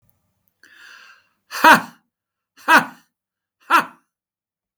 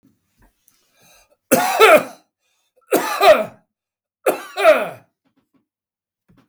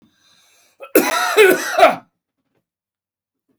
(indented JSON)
{
  "exhalation_length": "4.8 s",
  "exhalation_amplitude": 32768,
  "exhalation_signal_mean_std_ratio": 0.25,
  "three_cough_length": "6.5 s",
  "three_cough_amplitude": 32766,
  "three_cough_signal_mean_std_ratio": 0.35,
  "cough_length": "3.6 s",
  "cough_amplitude": 32768,
  "cough_signal_mean_std_ratio": 0.38,
  "survey_phase": "beta (2021-08-13 to 2022-03-07)",
  "age": "65+",
  "gender": "Male",
  "wearing_mask": "No",
  "symptom_none": true,
  "smoker_status": "Never smoked",
  "respiratory_condition_asthma": false,
  "respiratory_condition_other": false,
  "recruitment_source": "REACT",
  "submission_delay": "3 days",
  "covid_test_result": "Negative",
  "covid_test_method": "RT-qPCR",
  "influenza_a_test_result": "Negative",
  "influenza_b_test_result": "Negative"
}